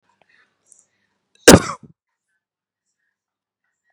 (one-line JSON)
{"cough_length": "3.9 s", "cough_amplitude": 32768, "cough_signal_mean_std_ratio": 0.15, "survey_phase": "beta (2021-08-13 to 2022-03-07)", "age": "18-44", "gender": "Male", "wearing_mask": "No", "symptom_none": true, "symptom_onset": "9 days", "smoker_status": "Never smoked", "respiratory_condition_asthma": false, "respiratory_condition_other": false, "recruitment_source": "REACT", "submission_delay": "1 day", "covid_test_result": "Negative", "covid_test_method": "RT-qPCR", "influenza_a_test_result": "Negative", "influenza_b_test_result": "Negative"}